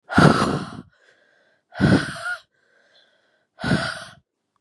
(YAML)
exhalation_length: 4.6 s
exhalation_amplitude: 32683
exhalation_signal_mean_std_ratio: 0.39
survey_phase: beta (2021-08-13 to 2022-03-07)
age: 18-44
gender: Female
wearing_mask: 'No'
symptom_runny_or_blocked_nose: true
symptom_fatigue: true
symptom_fever_high_temperature: true
symptom_headache: true
symptom_change_to_sense_of_smell_or_taste: true
smoker_status: Never smoked
respiratory_condition_asthma: false
respiratory_condition_other: false
recruitment_source: Test and Trace
submission_delay: 2 days
covid_test_result: Positive
covid_test_method: RT-qPCR
covid_ct_value: 21.6
covid_ct_gene: ORF1ab gene